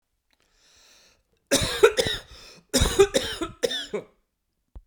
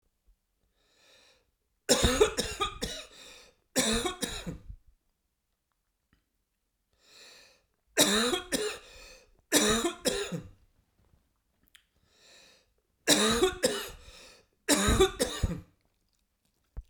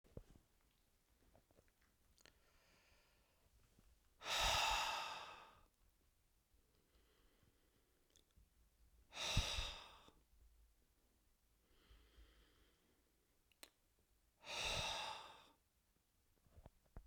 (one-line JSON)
{"cough_length": "4.9 s", "cough_amplitude": 24129, "cough_signal_mean_std_ratio": 0.38, "three_cough_length": "16.9 s", "three_cough_amplitude": 13732, "three_cough_signal_mean_std_ratio": 0.4, "exhalation_length": "17.1 s", "exhalation_amplitude": 1768, "exhalation_signal_mean_std_ratio": 0.34, "survey_phase": "beta (2021-08-13 to 2022-03-07)", "age": "45-64", "gender": "Male", "wearing_mask": "No", "symptom_none": true, "symptom_onset": "4 days", "smoker_status": "Ex-smoker", "respiratory_condition_asthma": false, "respiratory_condition_other": false, "recruitment_source": "REACT", "submission_delay": "2 days", "covid_test_result": "Negative", "covid_test_method": "RT-qPCR"}